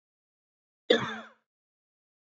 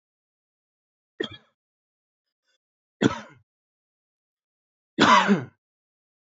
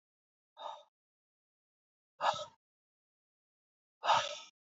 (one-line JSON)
{"cough_length": "2.3 s", "cough_amplitude": 15797, "cough_signal_mean_std_ratio": 0.21, "three_cough_length": "6.3 s", "three_cough_amplitude": 24287, "three_cough_signal_mean_std_ratio": 0.23, "exhalation_length": "4.8 s", "exhalation_amplitude": 5126, "exhalation_signal_mean_std_ratio": 0.25, "survey_phase": "beta (2021-08-13 to 2022-03-07)", "age": "18-44", "gender": "Male", "wearing_mask": "No", "symptom_none": true, "smoker_status": "Current smoker (1 to 10 cigarettes per day)", "respiratory_condition_asthma": false, "respiratory_condition_other": false, "recruitment_source": "REACT", "submission_delay": "5 days", "covid_test_result": "Negative", "covid_test_method": "RT-qPCR", "influenza_a_test_result": "Negative", "influenza_b_test_result": "Negative"}